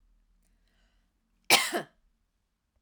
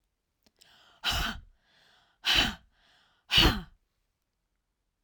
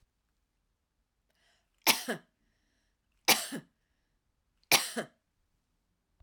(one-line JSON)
{"cough_length": "2.8 s", "cough_amplitude": 21507, "cough_signal_mean_std_ratio": 0.22, "exhalation_length": "5.0 s", "exhalation_amplitude": 11938, "exhalation_signal_mean_std_ratio": 0.32, "three_cough_length": "6.2 s", "three_cough_amplitude": 13188, "three_cough_signal_mean_std_ratio": 0.22, "survey_phase": "beta (2021-08-13 to 2022-03-07)", "age": "45-64", "gender": "Female", "wearing_mask": "No", "symptom_none": true, "smoker_status": "Never smoked", "respiratory_condition_asthma": true, "respiratory_condition_other": false, "recruitment_source": "Test and Trace", "submission_delay": "1 day", "covid_test_result": "Negative", "covid_test_method": "RT-qPCR"}